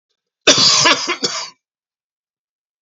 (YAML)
cough_length: 2.8 s
cough_amplitude: 32768
cough_signal_mean_std_ratio: 0.42
survey_phase: beta (2021-08-13 to 2022-03-07)
age: 65+
gender: Male
wearing_mask: 'No'
symptom_cough_any: true
symptom_onset: 5 days
smoker_status: Current smoker (1 to 10 cigarettes per day)
respiratory_condition_asthma: false
respiratory_condition_other: true
recruitment_source: REACT
submission_delay: 2 days
covid_test_result: Negative
covid_test_method: RT-qPCR
influenza_a_test_result: Negative
influenza_b_test_result: Negative